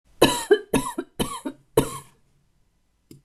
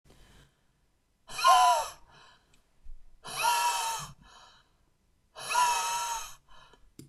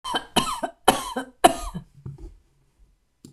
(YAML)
three_cough_length: 3.2 s
three_cough_amplitude: 25839
three_cough_signal_mean_std_ratio: 0.36
exhalation_length: 7.1 s
exhalation_amplitude: 10181
exhalation_signal_mean_std_ratio: 0.44
cough_length: 3.3 s
cough_amplitude: 26028
cough_signal_mean_std_ratio: 0.35
survey_phase: alpha (2021-03-01 to 2021-08-12)
age: 45-64
gender: Female
wearing_mask: 'No'
symptom_none: true
smoker_status: Ex-smoker
respiratory_condition_asthma: true
respiratory_condition_other: false
recruitment_source: REACT
submission_delay: 1 day
covid_test_result: Negative
covid_test_method: RT-qPCR